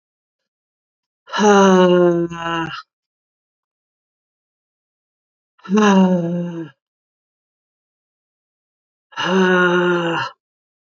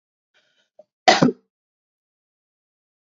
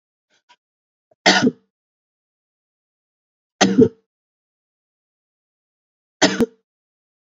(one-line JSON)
{"exhalation_length": "10.9 s", "exhalation_amplitude": 28736, "exhalation_signal_mean_std_ratio": 0.43, "cough_length": "3.1 s", "cough_amplitude": 28411, "cough_signal_mean_std_ratio": 0.2, "three_cough_length": "7.3 s", "three_cough_amplitude": 31647, "three_cough_signal_mean_std_ratio": 0.23, "survey_phase": "beta (2021-08-13 to 2022-03-07)", "age": "45-64", "gender": "Female", "wearing_mask": "No", "symptom_shortness_of_breath": true, "symptom_abdominal_pain": true, "symptom_change_to_sense_of_smell_or_taste": true, "symptom_other": true, "symptom_onset": "3 days", "smoker_status": "Ex-smoker", "respiratory_condition_asthma": false, "respiratory_condition_other": false, "recruitment_source": "Test and Trace", "submission_delay": "2 days", "covid_test_result": "Positive", "covid_test_method": "RT-qPCR", "covid_ct_value": 22.9, "covid_ct_gene": "N gene"}